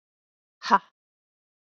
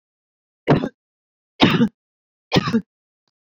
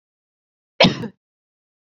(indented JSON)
{
  "exhalation_length": "1.7 s",
  "exhalation_amplitude": 19685,
  "exhalation_signal_mean_std_ratio": 0.18,
  "three_cough_length": "3.6 s",
  "three_cough_amplitude": 27822,
  "three_cough_signal_mean_std_ratio": 0.34,
  "cough_length": "2.0 s",
  "cough_amplitude": 29502,
  "cough_signal_mean_std_ratio": 0.22,
  "survey_phase": "beta (2021-08-13 to 2022-03-07)",
  "age": "45-64",
  "gender": "Female",
  "wearing_mask": "No",
  "symptom_none": true,
  "smoker_status": "Ex-smoker",
  "respiratory_condition_asthma": false,
  "respiratory_condition_other": false,
  "recruitment_source": "REACT",
  "submission_delay": "3 days",
  "covid_test_result": "Negative",
  "covid_test_method": "RT-qPCR"
}